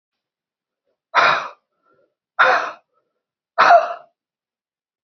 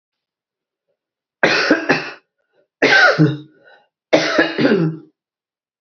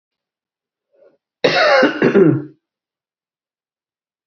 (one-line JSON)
{"exhalation_length": "5.0 s", "exhalation_amplitude": 27887, "exhalation_signal_mean_std_ratio": 0.33, "three_cough_length": "5.8 s", "three_cough_amplitude": 32767, "three_cough_signal_mean_std_ratio": 0.46, "cough_length": "4.3 s", "cough_amplitude": 27723, "cough_signal_mean_std_ratio": 0.38, "survey_phase": "beta (2021-08-13 to 2022-03-07)", "age": "65+", "gender": "Female", "wearing_mask": "No", "symptom_none": true, "symptom_onset": "12 days", "smoker_status": "Ex-smoker", "respiratory_condition_asthma": false, "respiratory_condition_other": false, "recruitment_source": "REACT", "submission_delay": "4 days", "covid_test_result": "Negative", "covid_test_method": "RT-qPCR", "influenza_a_test_result": "Unknown/Void", "influenza_b_test_result": "Unknown/Void"}